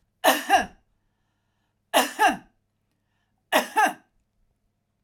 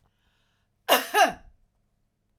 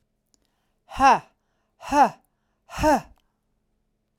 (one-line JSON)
{"three_cough_length": "5.0 s", "three_cough_amplitude": 18055, "three_cough_signal_mean_std_ratio": 0.34, "cough_length": "2.4 s", "cough_amplitude": 18596, "cough_signal_mean_std_ratio": 0.29, "exhalation_length": "4.2 s", "exhalation_amplitude": 20754, "exhalation_signal_mean_std_ratio": 0.31, "survey_phase": "alpha (2021-03-01 to 2021-08-12)", "age": "45-64", "gender": "Female", "wearing_mask": "No", "symptom_none": true, "smoker_status": "Ex-smoker", "respiratory_condition_asthma": false, "respiratory_condition_other": false, "recruitment_source": "REACT", "submission_delay": "1 day", "covid_test_result": "Negative", "covid_test_method": "RT-qPCR"}